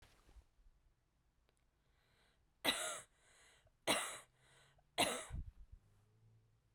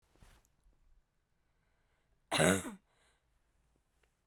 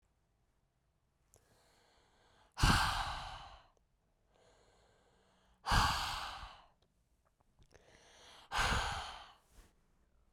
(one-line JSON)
{"three_cough_length": "6.7 s", "three_cough_amplitude": 3197, "three_cough_signal_mean_std_ratio": 0.32, "cough_length": "4.3 s", "cough_amplitude": 11001, "cough_signal_mean_std_ratio": 0.22, "exhalation_length": "10.3 s", "exhalation_amplitude": 5439, "exhalation_signal_mean_std_ratio": 0.34, "survey_phase": "beta (2021-08-13 to 2022-03-07)", "age": "18-44", "gender": "Female", "wearing_mask": "No", "symptom_cough_any": true, "symptom_sore_throat": true, "symptom_change_to_sense_of_smell_or_taste": true, "symptom_loss_of_taste": true, "symptom_onset": "2 days", "smoker_status": "Never smoked", "respiratory_condition_asthma": false, "respiratory_condition_other": false, "recruitment_source": "Test and Trace", "submission_delay": "2 days", "covid_test_result": "Positive", "covid_test_method": "RT-qPCR", "covid_ct_value": 27.8, "covid_ct_gene": "N gene"}